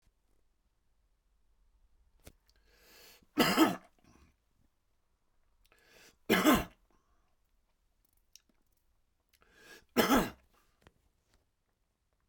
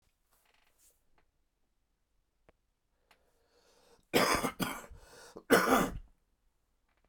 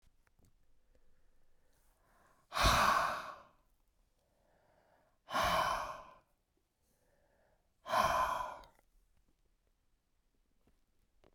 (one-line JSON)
{"three_cough_length": "12.3 s", "three_cough_amplitude": 8779, "three_cough_signal_mean_std_ratio": 0.24, "cough_length": "7.1 s", "cough_amplitude": 11366, "cough_signal_mean_std_ratio": 0.29, "exhalation_length": "11.3 s", "exhalation_amplitude": 5044, "exhalation_signal_mean_std_ratio": 0.35, "survey_phase": "beta (2021-08-13 to 2022-03-07)", "age": "65+", "gender": "Male", "wearing_mask": "No", "symptom_prefer_not_to_say": true, "smoker_status": "Ex-smoker", "respiratory_condition_asthma": false, "respiratory_condition_other": false, "recruitment_source": "Test and Trace", "submission_delay": "2 days", "covid_test_result": "Positive", "covid_test_method": "LFT"}